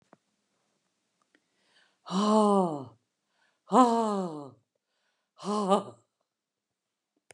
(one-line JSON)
{"exhalation_length": "7.3 s", "exhalation_amplitude": 14695, "exhalation_signal_mean_std_ratio": 0.34, "survey_phase": "beta (2021-08-13 to 2022-03-07)", "age": "65+", "gender": "Female", "wearing_mask": "No", "symptom_none": true, "smoker_status": "Never smoked", "respiratory_condition_asthma": false, "respiratory_condition_other": false, "recruitment_source": "REACT", "submission_delay": "2 days", "covid_test_result": "Negative", "covid_test_method": "RT-qPCR"}